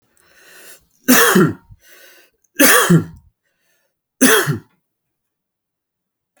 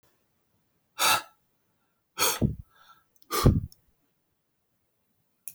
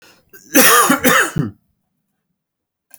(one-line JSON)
{"three_cough_length": "6.4 s", "three_cough_amplitude": 32768, "three_cough_signal_mean_std_ratio": 0.36, "exhalation_length": "5.5 s", "exhalation_amplitude": 15066, "exhalation_signal_mean_std_ratio": 0.3, "cough_length": "3.0 s", "cough_amplitude": 32768, "cough_signal_mean_std_ratio": 0.43, "survey_phase": "beta (2021-08-13 to 2022-03-07)", "age": "45-64", "gender": "Male", "wearing_mask": "No", "symptom_cough_any": true, "symptom_runny_or_blocked_nose": true, "symptom_sore_throat": true, "symptom_fatigue": true, "symptom_headache": true, "symptom_other": true, "symptom_onset": "6 days", "smoker_status": "Never smoked", "respiratory_condition_asthma": false, "respiratory_condition_other": false, "recruitment_source": "Test and Trace", "submission_delay": "2 days", "covid_test_result": "Positive", "covid_test_method": "RT-qPCR", "covid_ct_value": 23.4, "covid_ct_gene": "ORF1ab gene"}